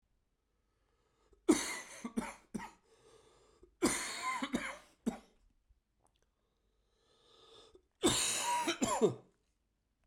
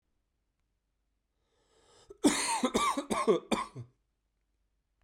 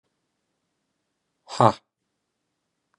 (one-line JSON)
{"three_cough_length": "10.1 s", "three_cough_amplitude": 5357, "three_cough_signal_mean_std_ratio": 0.39, "cough_length": "5.0 s", "cough_amplitude": 7988, "cough_signal_mean_std_ratio": 0.38, "exhalation_length": "3.0 s", "exhalation_amplitude": 28239, "exhalation_signal_mean_std_ratio": 0.15, "survey_phase": "beta (2021-08-13 to 2022-03-07)", "age": "45-64", "gender": "Male", "wearing_mask": "No", "symptom_cough_any": true, "symptom_new_continuous_cough": true, "symptom_runny_or_blocked_nose": true, "symptom_shortness_of_breath": true, "symptom_sore_throat": true, "symptom_fever_high_temperature": true, "symptom_headache": true, "symptom_change_to_sense_of_smell_or_taste": true, "symptom_loss_of_taste": true, "symptom_onset": "5 days", "smoker_status": "Never smoked", "respiratory_condition_asthma": false, "respiratory_condition_other": false, "recruitment_source": "Test and Trace", "submission_delay": "2 days", "covid_test_result": "Positive", "covid_test_method": "RT-qPCR", "covid_ct_value": 22.8, "covid_ct_gene": "ORF1ab gene", "covid_ct_mean": 23.4, "covid_viral_load": "22000 copies/ml", "covid_viral_load_category": "Low viral load (10K-1M copies/ml)"}